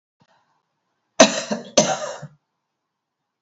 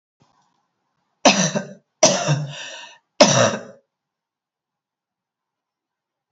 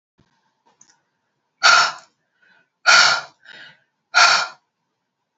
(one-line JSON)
{"cough_length": "3.4 s", "cough_amplitude": 31487, "cough_signal_mean_std_ratio": 0.27, "three_cough_length": "6.3 s", "three_cough_amplitude": 31159, "three_cough_signal_mean_std_ratio": 0.32, "exhalation_length": "5.4 s", "exhalation_amplitude": 30183, "exhalation_signal_mean_std_ratio": 0.34, "survey_phase": "alpha (2021-03-01 to 2021-08-12)", "age": "45-64", "gender": "Female", "wearing_mask": "No", "symptom_none": true, "smoker_status": "Never smoked", "respiratory_condition_asthma": false, "respiratory_condition_other": false, "recruitment_source": "REACT", "submission_delay": "2 days", "covid_test_result": "Negative", "covid_test_method": "RT-qPCR"}